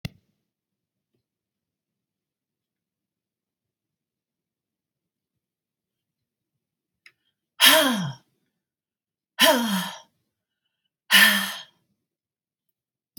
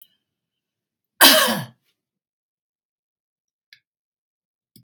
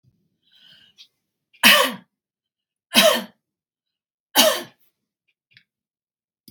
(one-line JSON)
{"exhalation_length": "13.2 s", "exhalation_amplitude": 32768, "exhalation_signal_mean_std_ratio": 0.24, "cough_length": "4.8 s", "cough_amplitude": 32768, "cough_signal_mean_std_ratio": 0.21, "three_cough_length": "6.5 s", "three_cough_amplitude": 32768, "three_cough_signal_mean_std_ratio": 0.27, "survey_phase": "beta (2021-08-13 to 2022-03-07)", "age": "65+", "gender": "Female", "wearing_mask": "No", "symptom_none": true, "symptom_onset": "12 days", "smoker_status": "Ex-smoker", "respiratory_condition_asthma": true, "respiratory_condition_other": false, "recruitment_source": "REACT", "submission_delay": "2 days", "covid_test_result": "Negative", "covid_test_method": "RT-qPCR", "influenza_a_test_result": "Negative", "influenza_b_test_result": "Negative"}